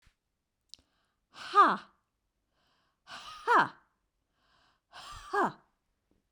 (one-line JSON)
{"exhalation_length": "6.3 s", "exhalation_amplitude": 9476, "exhalation_signal_mean_std_ratio": 0.26, "survey_phase": "beta (2021-08-13 to 2022-03-07)", "age": "45-64", "gender": "Female", "wearing_mask": "No", "symptom_runny_or_blocked_nose": true, "symptom_onset": "2 days", "smoker_status": "Ex-smoker", "respiratory_condition_asthma": false, "respiratory_condition_other": false, "recruitment_source": "REACT", "submission_delay": "1 day", "covid_test_result": "Negative", "covid_test_method": "RT-qPCR", "influenza_a_test_result": "Negative", "influenza_b_test_result": "Negative"}